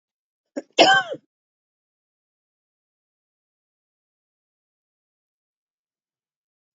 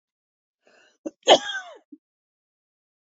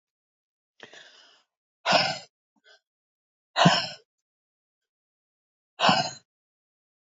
{"three_cough_length": "6.7 s", "three_cough_amplitude": 27438, "three_cough_signal_mean_std_ratio": 0.16, "cough_length": "3.2 s", "cough_amplitude": 27411, "cough_signal_mean_std_ratio": 0.19, "exhalation_length": "7.1 s", "exhalation_amplitude": 19051, "exhalation_signal_mean_std_ratio": 0.27, "survey_phase": "beta (2021-08-13 to 2022-03-07)", "age": "45-64", "gender": "Female", "wearing_mask": "No", "symptom_shortness_of_breath": true, "symptom_fatigue": true, "symptom_change_to_sense_of_smell_or_taste": true, "symptom_loss_of_taste": true, "symptom_onset": "12 days", "smoker_status": "Never smoked", "respiratory_condition_asthma": false, "respiratory_condition_other": false, "recruitment_source": "REACT", "submission_delay": "2 days", "covid_test_result": "Negative", "covid_test_method": "RT-qPCR", "influenza_a_test_result": "Negative", "influenza_b_test_result": "Negative"}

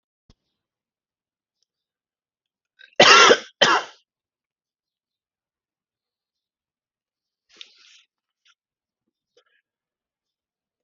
{"cough_length": "10.8 s", "cough_amplitude": 31874, "cough_signal_mean_std_ratio": 0.18, "survey_phase": "alpha (2021-03-01 to 2021-08-12)", "age": "45-64", "gender": "Male", "wearing_mask": "No", "symptom_none": true, "smoker_status": "Ex-smoker", "respiratory_condition_asthma": false, "respiratory_condition_other": false, "recruitment_source": "REACT", "submission_delay": "2 days", "covid_test_result": "Negative", "covid_test_method": "RT-qPCR"}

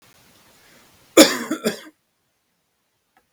{"cough_length": "3.3 s", "cough_amplitude": 32768, "cough_signal_mean_std_ratio": 0.22, "survey_phase": "beta (2021-08-13 to 2022-03-07)", "age": "45-64", "gender": "Male", "wearing_mask": "No", "symptom_cough_any": true, "smoker_status": "Never smoked", "respiratory_condition_asthma": false, "respiratory_condition_other": false, "recruitment_source": "REACT", "submission_delay": "2 days", "covid_test_result": "Negative", "covid_test_method": "RT-qPCR", "influenza_a_test_result": "Negative", "influenza_b_test_result": "Negative"}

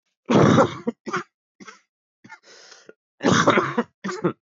{"cough_length": "4.5 s", "cough_amplitude": 20239, "cough_signal_mean_std_ratio": 0.43, "survey_phase": "beta (2021-08-13 to 2022-03-07)", "age": "18-44", "gender": "Male", "wearing_mask": "No", "symptom_cough_any": true, "symptom_runny_or_blocked_nose": true, "symptom_shortness_of_breath": true, "symptom_sore_throat": true, "symptom_abdominal_pain": true, "symptom_fatigue": true, "symptom_fever_high_temperature": true, "symptom_headache": true, "symptom_change_to_sense_of_smell_or_taste": true, "symptom_loss_of_taste": true, "symptom_onset": "5 days", "smoker_status": "Never smoked", "respiratory_condition_asthma": false, "respiratory_condition_other": false, "recruitment_source": "Test and Trace", "submission_delay": "1 day", "covid_test_result": "Positive", "covid_test_method": "RT-qPCR", "covid_ct_value": 18.5, "covid_ct_gene": "ORF1ab gene", "covid_ct_mean": 19.6, "covid_viral_load": "380000 copies/ml", "covid_viral_load_category": "Low viral load (10K-1M copies/ml)"}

